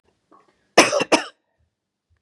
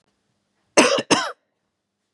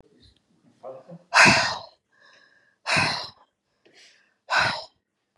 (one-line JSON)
{"three_cough_length": "2.2 s", "three_cough_amplitude": 32768, "three_cough_signal_mean_std_ratio": 0.28, "cough_length": "2.1 s", "cough_amplitude": 32367, "cough_signal_mean_std_ratio": 0.33, "exhalation_length": "5.4 s", "exhalation_amplitude": 26304, "exhalation_signal_mean_std_ratio": 0.34, "survey_phase": "beta (2021-08-13 to 2022-03-07)", "age": "45-64", "gender": "Female", "wearing_mask": "No", "symptom_none": true, "smoker_status": "Never smoked", "respiratory_condition_asthma": false, "respiratory_condition_other": false, "recruitment_source": "REACT", "submission_delay": "1 day", "covid_test_result": "Negative", "covid_test_method": "RT-qPCR", "influenza_a_test_result": "Negative", "influenza_b_test_result": "Negative"}